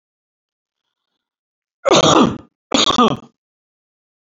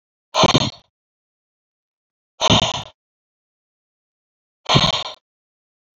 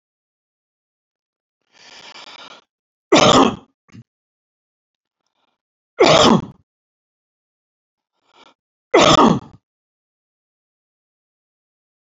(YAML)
cough_length: 4.4 s
cough_amplitude: 31144
cough_signal_mean_std_ratio: 0.34
exhalation_length: 6.0 s
exhalation_amplitude: 27165
exhalation_signal_mean_std_ratio: 0.31
three_cough_length: 12.1 s
three_cough_amplitude: 30606
three_cough_signal_mean_std_ratio: 0.26
survey_phase: beta (2021-08-13 to 2022-03-07)
age: 65+
gender: Male
wearing_mask: 'No'
symptom_none: true
smoker_status: Never smoked
respiratory_condition_asthma: false
respiratory_condition_other: false
recruitment_source: Test and Trace
submission_delay: 0 days
covid_test_result: Negative
covid_test_method: LFT